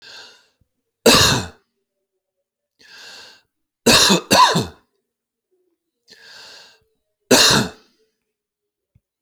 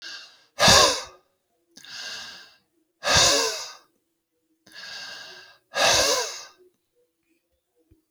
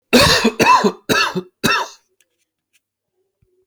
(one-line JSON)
{"three_cough_length": "9.2 s", "three_cough_amplitude": 32598, "three_cough_signal_mean_std_ratio": 0.32, "exhalation_length": "8.1 s", "exhalation_amplitude": 22232, "exhalation_signal_mean_std_ratio": 0.38, "cough_length": "3.7 s", "cough_amplitude": 30744, "cough_signal_mean_std_ratio": 0.47, "survey_phase": "alpha (2021-03-01 to 2021-08-12)", "age": "45-64", "gender": "Male", "wearing_mask": "No", "symptom_none": true, "symptom_onset": "12 days", "smoker_status": "Ex-smoker", "respiratory_condition_asthma": false, "respiratory_condition_other": false, "recruitment_source": "REACT", "submission_delay": "1 day", "covid_test_result": "Negative", "covid_test_method": "RT-qPCR"}